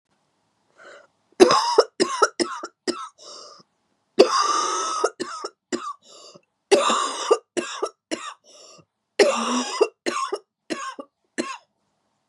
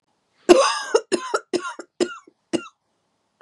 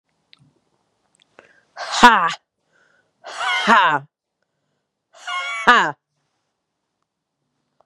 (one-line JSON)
{"three_cough_length": "12.3 s", "three_cough_amplitude": 32767, "three_cough_signal_mean_std_ratio": 0.42, "cough_length": "3.4 s", "cough_amplitude": 32767, "cough_signal_mean_std_ratio": 0.35, "exhalation_length": "7.9 s", "exhalation_amplitude": 32768, "exhalation_signal_mean_std_ratio": 0.3, "survey_phase": "beta (2021-08-13 to 2022-03-07)", "age": "18-44", "gender": "Female", "wearing_mask": "No", "symptom_cough_any": true, "symptom_runny_or_blocked_nose": true, "symptom_sore_throat": true, "symptom_fatigue": true, "symptom_headache": true, "symptom_change_to_sense_of_smell_or_taste": true, "symptom_onset": "5 days", "smoker_status": "Ex-smoker", "respiratory_condition_asthma": false, "respiratory_condition_other": false, "recruitment_source": "Test and Trace", "submission_delay": "2 days", "covid_test_result": "Positive", "covid_test_method": "RT-qPCR", "covid_ct_value": 21.9, "covid_ct_gene": "ORF1ab gene", "covid_ct_mean": 22.7, "covid_viral_load": "37000 copies/ml", "covid_viral_load_category": "Low viral load (10K-1M copies/ml)"}